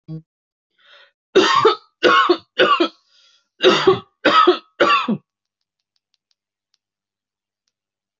{"three_cough_length": "8.2 s", "three_cough_amplitude": 27554, "three_cough_signal_mean_std_ratio": 0.41, "survey_phase": "alpha (2021-03-01 to 2021-08-12)", "age": "18-44", "gender": "Male", "wearing_mask": "No", "symptom_none": true, "smoker_status": "Never smoked", "respiratory_condition_asthma": false, "respiratory_condition_other": false, "recruitment_source": "REACT", "submission_delay": "1 day", "covid_test_result": "Negative", "covid_test_method": "RT-qPCR"}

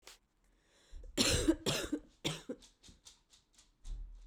{"three_cough_length": "4.3 s", "three_cough_amplitude": 5250, "three_cough_signal_mean_std_ratio": 0.42, "survey_phase": "beta (2021-08-13 to 2022-03-07)", "age": "18-44", "gender": "Female", "wearing_mask": "No", "symptom_cough_any": true, "symptom_runny_or_blocked_nose": true, "symptom_shortness_of_breath": true, "symptom_diarrhoea": true, "symptom_fatigue": true, "symptom_headache": true, "symptom_change_to_sense_of_smell_or_taste": true, "symptom_loss_of_taste": true, "symptom_other": true, "symptom_onset": "4 days", "smoker_status": "Current smoker (e-cigarettes or vapes only)", "respiratory_condition_asthma": false, "respiratory_condition_other": false, "recruitment_source": "Test and Trace", "submission_delay": "2 days", "covid_test_result": "Positive", "covid_test_method": "RT-qPCR", "covid_ct_value": 19.9, "covid_ct_gene": "ORF1ab gene", "covid_ct_mean": 20.6, "covid_viral_load": "170000 copies/ml", "covid_viral_load_category": "Low viral load (10K-1M copies/ml)"}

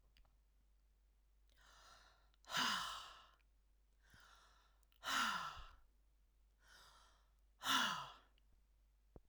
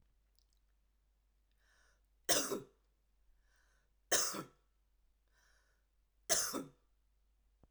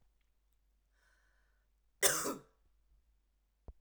{"exhalation_length": "9.3 s", "exhalation_amplitude": 2191, "exhalation_signal_mean_std_ratio": 0.37, "three_cough_length": "7.7 s", "three_cough_amplitude": 5186, "three_cough_signal_mean_std_ratio": 0.27, "cough_length": "3.8 s", "cough_amplitude": 6588, "cough_signal_mean_std_ratio": 0.23, "survey_phase": "beta (2021-08-13 to 2022-03-07)", "age": "45-64", "gender": "Female", "wearing_mask": "No", "symptom_none": true, "smoker_status": "Never smoked", "respiratory_condition_asthma": false, "respiratory_condition_other": false, "recruitment_source": "REACT", "submission_delay": "2 days", "covid_test_result": "Negative", "covid_test_method": "RT-qPCR"}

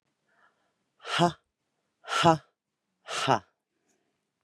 {"exhalation_length": "4.4 s", "exhalation_amplitude": 16804, "exhalation_signal_mean_std_ratio": 0.28, "survey_phase": "beta (2021-08-13 to 2022-03-07)", "age": "45-64", "gender": "Female", "wearing_mask": "No", "symptom_runny_or_blocked_nose": true, "smoker_status": "Ex-smoker", "respiratory_condition_asthma": false, "respiratory_condition_other": false, "recruitment_source": "REACT", "submission_delay": "1 day", "covid_test_result": "Negative", "covid_test_method": "RT-qPCR"}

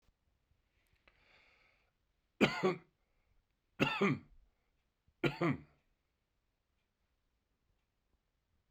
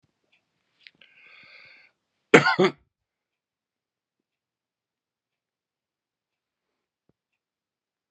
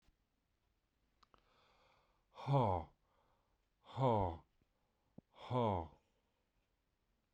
{"three_cough_length": "8.7 s", "three_cough_amplitude": 6731, "three_cough_signal_mean_std_ratio": 0.25, "cough_length": "8.1 s", "cough_amplitude": 32767, "cough_signal_mean_std_ratio": 0.14, "exhalation_length": "7.3 s", "exhalation_amplitude": 2091, "exhalation_signal_mean_std_ratio": 0.34, "survey_phase": "beta (2021-08-13 to 2022-03-07)", "age": "65+", "gender": "Male", "wearing_mask": "No", "symptom_none": true, "smoker_status": "Ex-smoker", "respiratory_condition_asthma": false, "respiratory_condition_other": false, "recruitment_source": "REACT", "submission_delay": "1 day", "covid_test_result": "Negative", "covid_test_method": "RT-qPCR"}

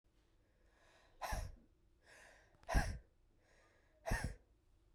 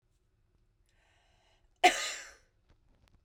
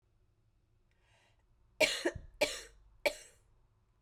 {"exhalation_length": "4.9 s", "exhalation_amplitude": 2687, "exhalation_signal_mean_std_ratio": 0.34, "cough_length": "3.2 s", "cough_amplitude": 11944, "cough_signal_mean_std_ratio": 0.2, "three_cough_length": "4.0 s", "three_cough_amplitude": 7848, "three_cough_signal_mean_std_ratio": 0.28, "survey_phase": "beta (2021-08-13 to 2022-03-07)", "age": "18-44", "gender": "Female", "wearing_mask": "No", "symptom_cough_any": true, "symptom_runny_or_blocked_nose": true, "symptom_sore_throat": true, "symptom_fatigue": true, "symptom_change_to_sense_of_smell_or_taste": true, "symptom_onset": "3 days", "smoker_status": "Never smoked", "respiratory_condition_asthma": false, "respiratory_condition_other": false, "recruitment_source": "Test and Trace", "submission_delay": "1 day", "covid_test_result": "Positive", "covid_test_method": "RT-qPCR", "covid_ct_value": 18.7, "covid_ct_gene": "ORF1ab gene"}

